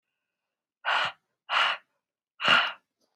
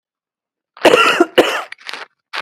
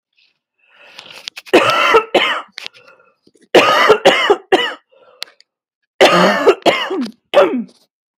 exhalation_length: 3.2 s
exhalation_amplitude: 15194
exhalation_signal_mean_std_ratio: 0.4
cough_length: 2.4 s
cough_amplitude: 32768
cough_signal_mean_std_ratio: 0.42
three_cough_length: 8.2 s
three_cough_amplitude: 32768
three_cough_signal_mean_std_ratio: 0.49
survey_phase: beta (2021-08-13 to 2022-03-07)
age: 18-44
gender: Female
wearing_mask: 'No'
symptom_none: true
symptom_onset: 4 days
smoker_status: Never smoked
respiratory_condition_asthma: false
respiratory_condition_other: true
recruitment_source: Test and Trace
submission_delay: 2 days
covid_test_result: Negative
covid_test_method: ePCR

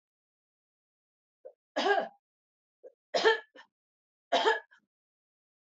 three_cough_length: 5.6 s
three_cough_amplitude: 9629
three_cough_signal_mean_std_ratio: 0.29
survey_phase: beta (2021-08-13 to 2022-03-07)
age: 45-64
gender: Female
wearing_mask: 'No'
symptom_cough_any: true
symptom_runny_or_blocked_nose: true
symptom_headache: true
smoker_status: Ex-smoker
respiratory_condition_asthma: false
respiratory_condition_other: false
recruitment_source: Test and Trace
submission_delay: 2 days
covid_test_result: Positive
covid_test_method: RT-qPCR
covid_ct_value: 17.9
covid_ct_gene: ORF1ab gene
covid_ct_mean: 18.6
covid_viral_load: 800000 copies/ml
covid_viral_load_category: Low viral load (10K-1M copies/ml)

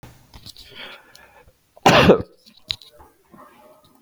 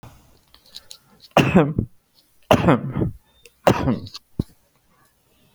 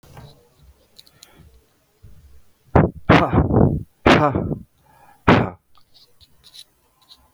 cough_length: 4.0 s
cough_amplitude: 29652
cough_signal_mean_std_ratio: 0.27
three_cough_length: 5.5 s
three_cough_amplitude: 32768
three_cough_signal_mean_std_ratio: 0.36
exhalation_length: 7.3 s
exhalation_amplitude: 32768
exhalation_signal_mean_std_ratio: 0.36
survey_phase: alpha (2021-03-01 to 2021-08-12)
age: 45-64
gender: Male
wearing_mask: 'No'
symptom_diarrhoea: true
smoker_status: Ex-smoker
respiratory_condition_asthma: false
respiratory_condition_other: false
recruitment_source: REACT
submission_delay: 2 days
covid_test_result: Negative
covid_test_method: RT-qPCR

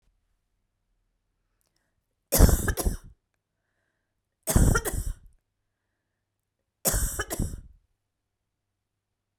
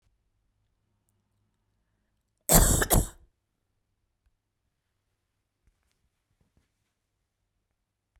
three_cough_length: 9.4 s
three_cough_amplitude: 26451
three_cough_signal_mean_std_ratio: 0.29
cough_length: 8.2 s
cough_amplitude: 26837
cough_signal_mean_std_ratio: 0.2
survey_phase: beta (2021-08-13 to 2022-03-07)
age: 45-64
gender: Female
wearing_mask: 'No'
symptom_none: true
symptom_onset: 12 days
smoker_status: Never smoked
respiratory_condition_asthma: false
respiratory_condition_other: false
recruitment_source: REACT
submission_delay: 1 day
covid_test_result: Negative
covid_test_method: RT-qPCR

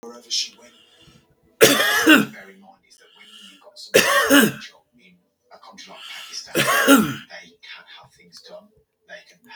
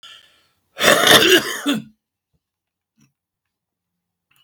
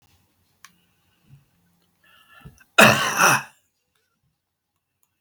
three_cough_length: 9.6 s
three_cough_amplitude: 32768
three_cough_signal_mean_std_ratio: 0.38
cough_length: 4.4 s
cough_amplitude: 32768
cough_signal_mean_std_ratio: 0.34
exhalation_length: 5.2 s
exhalation_amplitude: 32768
exhalation_signal_mean_std_ratio: 0.25
survey_phase: beta (2021-08-13 to 2022-03-07)
age: 65+
gender: Male
wearing_mask: 'No'
symptom_cough_any: true
smoker_status: Ex-smoker
respiratory_condition_asthma: false
respiratory_condition_other: false
recruitment_source: REACT
submission_delay: 5 days
covid_test_result: Negative
covid_test_method: RT-qPCR
influenza_a_test_result: Negative
influenza_b_test_result: Negative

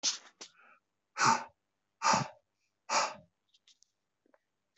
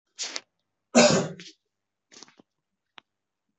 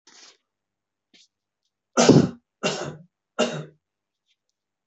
exhalation_length: 4.8 s
exhalation_amplitude: 7968
exhalation_signal_mean_std_ratio: 0.33
cough_length: 3.6 s
cough_amplitude: 22536
cough_signal_mean_std_ratio: 0.26
three_cough_length: 4.9 s
three_cough_amplitude: 23577
three_cough_signal_mean_std_ratio: 0.27
survey_phase: beta (2021-08-13 to 2022-03-07)
age: 18-44
gender: Male
wearing_mask: 'No'
symptom_none: true
smoker_status: Never smoked
respiratory_condition_asthma: false
respiratory_condition_other: false
recruitment_source: REACT
submission_delay: 3 days
covid_test_result: Negative
covid_test_method: RT-qPCR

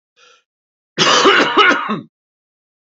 cough_length: 3.0 s
cough_amplitude: 31437
cough_signal_mean_std_ratio: 0.47
survey_phase: beta (2021-08-13 to 2022-03-07)
age: 45-64
gender: Male
wearing_mask: 'No'
symptom_cough_any: true
symptom_runny_or_blocked_nose: true
symptom_sore_throat: true
symptom_headache: true
symptom_onset: 5 days
smoker_status: Ex-smoker
respiratory_condition_asthma: false
respiratory_condition_other: false
recruitment_source: Test and Trace
submission_delay: 1 day
covid_test_result: Positive
covid_test_method: LAMP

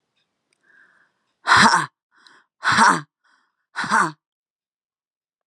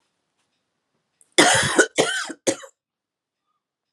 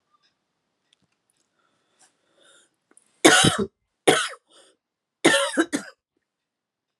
exhalation_length: 5.5 s
exhalation_amplitude: 28273
exhalation_signal_mean_std_ratio: 0.33
cough_length: 3.9 s
cough_amplitude: 31739
cough_signal_mean_std_ratio: 0.34
three_cough_length: 7.0 s
three_cough_amplitude: 32215
three_cough_signal_mean_std_ratio: 0.28
survey_phase: beta (2021-08-13 to 2022-03-07)
age: 45-64
gender: Female
wearing_mask: 'No'
symptom_cough_any: true
symptom_new_continuous_cough: true
symptom_runny_or_blocked_nose: true
symptom_sore_throat: true
symptom_fatigue: true
symptom_other: true
symptom_onset: 1 day
smoker_status: Never smoked
respiratory_condition_asthma: false
respiratory_condition_other: false
recruitment_source: Test and Trace
submission_delay: 1 day
covid_test_result: Negative
covid_test_method: RT-qPCR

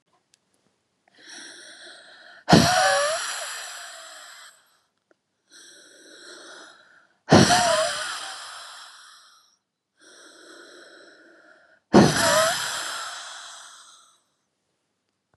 exhalation_length: 15.4 s
exhalation_amplitude: 32398
exhalation_signal_mean_std_ratio: 0.35
survey_phase: beta (2021-08-13 to 2022-03-07)
age: 18-44
gender: Female
wearing_mask: 'No'
symptom_cough_any: true
symptom_runny_or_blocked_nose: true
symptom_shortness_of_breath: true
symptom_fatigue: true
symptom_headache: true
symptom_onset: 2 days
smoker_status: Never smoked
respiratory_condition_asthma: true
respiratory_condition_other: false
recruitment_source: Test and Trace
submission_delay: 2 days
covid_test_result: Positive
covid_test_method: RT-qPCR
covid_ct_value: 24.3
covid_ct_gene: N gene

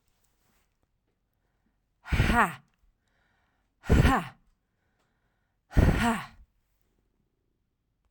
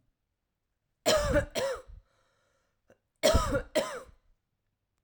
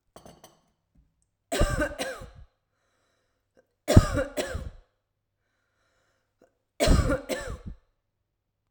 exhalation_length: 8.1 s
exhalation_amplitude: 12573
exhalation_signal_mean_std_ratio: 0.3
cough_length: 5.0 s
cough_amplitude: 9755
cough_signal_mean_std_ratio: 0.39
three_cough_length: 8.7 s
three_cough_amplitude: 32767
three_cough_signal_mean_std_ratio: 0.3
survey_phase: alpha (2021-03-01 to 2021-08-12)
age: 18-44
gender: Female
wearing_mask: 'Yes'
symptom_none: true
smoker_status: Ex-smoker
respiratory_condition_asthma: false
respiratory_condition_other: false
recruitment_source: REACT
submission_delay: 2 days
covid_test_result: Negative
covid_test_method: RT-qPCR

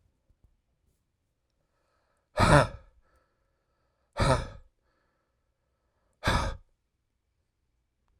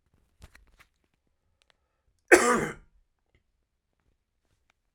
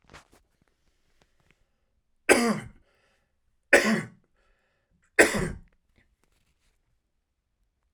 exhalation_length: 8.2 s
exhalation_amplitude: 19749
exhalation_signal_mean_std_ratio: 0.24
cough_length: 4.9 s
cough_amplitude: 26004
cough_signal_mean_std_ratio: 0.19
three_cough_length: 7.9 s
three_cough_amplitude: 26115
three_cough_signal_mean_std_ratio: 0.24
survey_phase: beta (2021-08-13 to 2022-03-07)
age: 18-44
gender: Male
wearing_mask: 'No'
symptom_cough_any: true
symptom_runny_or_blocked_nose: true
symptom_fatigue: true
symptom_headache: true
symptom_change_to_sense_of_smell_or_taste: true
symptom_loss_of_taste: true
symptom_onset: 9 days
smoker_status: Never smoked
respiratory_condition_asthma: false
respiratory_condition_other: false
recruitment_source: Test and Trace
submission_delay: 2 days
covid_test_result: Positive
covid_test_method: RT-qPCR
covid_ct_value: 15.1
covid_ct_gene: ORF1ab gene
covid_ct_mean: 15.6
covid_viral_load: 7900000 copies/ml
covid_viral_load_category: High viral load (>1M copies/ml)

